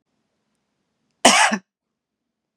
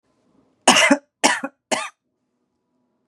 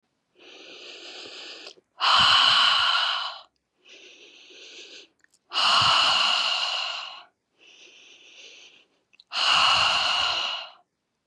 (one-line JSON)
{"cough_length": "2.6 s", "cough_amplitude": 32768, "cough_signal_mean_std_ratio": 0.26, "three_cough_length": "3.1 s", "three_cough_amplitude": 32767, "three_cough_signal_mean_std_ratio": 0.32, "exhalation_length": "11.3 s", "exhalation_amplitude": 18546, "exhalation_signal_mean_std_ratio": 0.54, "survey_phase": "beta (2021-08-13 to 2022-03-07)", "age": "18-44", "gender": "Female", "wearing_mask": "No", "symptom_none": true, "smoker_status": "Ex-smoker", "respiratory_condition_asthma": false, "respiratory_condition_other": false, "recruitment_source": "REACT", "submission_delay": "2 days", "covid_test_result": "Negative", "covid_test_method": "RT-qPCR", "influenza_a_test_result": "Negative", "influenza_b_test_result": "Negative"}